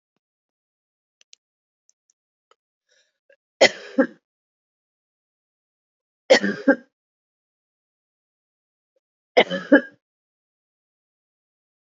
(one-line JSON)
{"three_cough_length": "11.9 s", "three_cough_amplitude": 29252, "three_cough_signal_mean_std_ratio": 0.18, "survey_phase": "beta (2021-08-13 to 2022-03-07)", "age": "45-64", "gender": "Female", "wearing_mask": "No", "symptom_sore_throat": true, "symptom_abdominal_pain": true, "symptom_fatigue": true, "symptom_headache": true, "symptom_onset": "5 days", "smoker_status": "Ex-smoker", "respiratory_condition_asthma": true, "respiratory_condition_other": false, "recruitment_source": "Test and Trace", "submission_delay": "1 day", "covid_test_result": "Negative", "covid_test_method": "RT-qPCR"}